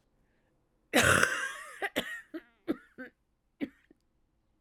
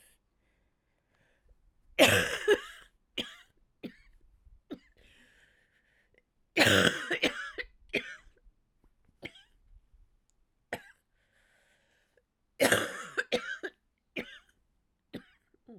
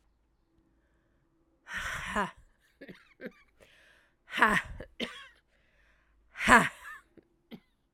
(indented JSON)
{
  "cough_length": "4.6 s",
  "cough_amplitude": 15853,
  "cough_signal_mean_std_ratio": 0.35,
  "three_cough_length": "15.8 s",
  "three_cough_amplitude": 15986,
  "three_cough_signal_mean_std_ratio": 0.28,
  "exhalation_length": "7.9 s",
  "exhalation_amplitude": 23617,
  "exhalation_signal_mean_std_ratio": 0.27,
  "survey_phase": "alpha (2021-03-01 to 2021-08-12)",
  "age": "45-64",
  "gender": "Female",
  "wearing_mask": "No",
  "symptom_cough_any": true,
  "symptom_fatigue": true,
  "symptom_fever_high_temperature": true,
  "symptom_headache": true,
  "symptom_change_to_sense_of_smell_or_taste": true,
  "symptom_loss_of_taste": true,
  "symptom_onset": "4 days",
  "smoker_status": "Never smoked",
  "respiratory_condition_asthma": true,
  "respiratory_condition_other": false,
  "recruitment_source": "Test and Trace",
  "submission_delay": "2 days",
  "covid_test_result": "Positive",
  "covid_test_method": "RT-qPCR",
  "covid_ct_value": 11.5,
  "covid_ct_gene": "ORF1ab gene",
  "covid_ct_mean": 11.9,
  "covid_viral_load": "120000000 copies/ml",
  "covid_viral_load_category": "High viral load (>1M copies/ml)"
}